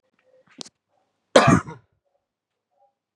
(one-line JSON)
{"cough_length": "3.2 s", "cough_amplitude": 31695, "cough_signal_mean_std_ratio": 0.22, "survey_phase": "beta (2021-08-13 to 2022-03-07)", "age": "18-44", "gender": "Male", "wearing_mask": "No", "symptom_cough_any": true, "symptom_new_continuous_cough": true, "symptom_runny_or_blocked_nose": true, "symptom_shortness_of_breath": true, "symptom_sore_throat": true, "symptom_fatigue": true, "symptom_fever_high_temperature": true, "symptom_headache": true, "symptom_change_to_sense_of_smell_or_taste": true, "symptom_loss_of_taste": true, "symptom_other": true, "symptom_onset": "3 days", "smoker_status": "Never smoked", "respiratory_condition_asthma": false, "respiratory_condition_other": false, "recruitment_source": "Test and Trace", "submission_delay": "2 days", "covid_test_result": "Positive", "covid_test_method": "RT-qPCR", "covid_ct_value": 15.6, "covid_ct_gene": "ORF1ab gene"}